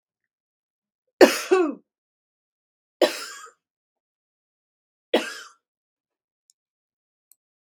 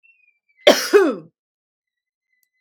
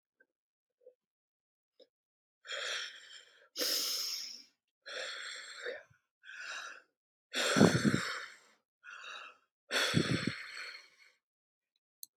{"three_cough_length": "7.6 s", "three_cough_amplitude": 32768, "three_cough_signal_mean_std_ratio": 0.21, "cough_length": "2.6 s", "cough_amplitude": 32768, "cough_signal_mean_std_ratio": 0.29, "exhalation_length": "12.2 s", "exhalation_amplitude": 9781, "exhalation_signal_mean_std_ratio": 0.39, "survey_phase": "beta (2021-08-13 to 2022-03-07)", "age": "65+", "gender": "Female", "wearing_mask": "No", "symptom_none": true, "smoker_status": "Never smoked", "respiratory_condition_asthma": false, "respiratory_condition_other": false, "recruitment_source": "REACT", "submission_delay": "2 days", "covid_test_result": "Negative", "covid_test_method": "RT-qPCR", "influenza_a_test_result": "Negative", "influenza_b_test_result": "Negative"}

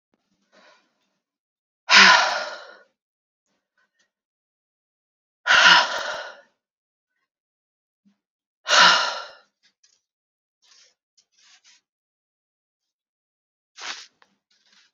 {"exhalation_length": "14.9 s", "exhalation_amplitude": 29892, "exhalation_signal_mean_std_ratio": 0.25, "survey_phase": "beta (2021-08-13 to 2022-03-07)", "age": "18-44", "gender": "Female", "wearing_mask": "No", "symptom_cough_any": true, "symptom_runny_or_blocked_nose": true, "symptom_shortness_of_breath": true, "symptom_fatigue": true, "symptom_headache": true, "symptom_change_to_sense_of_smell_or_taste": true, "symptom_loss_of_taste": true, "symptom_onset": "4 days", "smoker_status": "Ex-smoker", "respiratory_condition_asthma": false, "respiratory_condition_other": false, "recruitment_source": "Test and Trace", "submission_delay": "3 days", "covid_test_result": "Positive", "covid_test_method": "RT-qPCR", "covid_ct_value": 15.9, "covid_ct_gene": "ORF1ab gene", "covid_ct_mean": 16.1, "covid_viral_load": "5300000 copies/ml", "covid_viral_load_category": "High viral load (>1M copies/ml)"}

